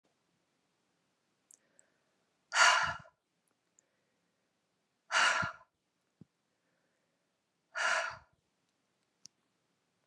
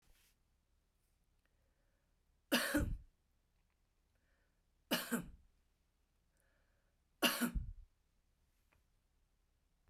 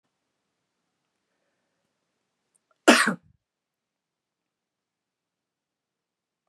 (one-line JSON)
{"exhalation_length": "10.1 s", "exhalation_amplitude": 7301, "exhalation_signal_mean_std_ratio": 0.25, "three_cough_length": "9.9 s", "three_cough_amplitude": 4108, "three_cough_signal_mean_std_ratio": 0.28, "cough_length": "6.5 s", "cough_amplitude": 28994, "cough_signal_mean_std_ratio": 0.14, "survey_phase": "beta (2021-08-13 to 2022-03-07)", "age": "65+", "gender": "Female", "wearing_mask": "No", "symptom_none": true, "smoker_status": "Ex-smoker", "respiratory_condition_asthma": false, "respiratory_condition_other": false, "recruitment_source": "REACT", "submission_delay": "2 days", "covid_test_result": "Negative", "covid_test_method": "RT-qPCR"}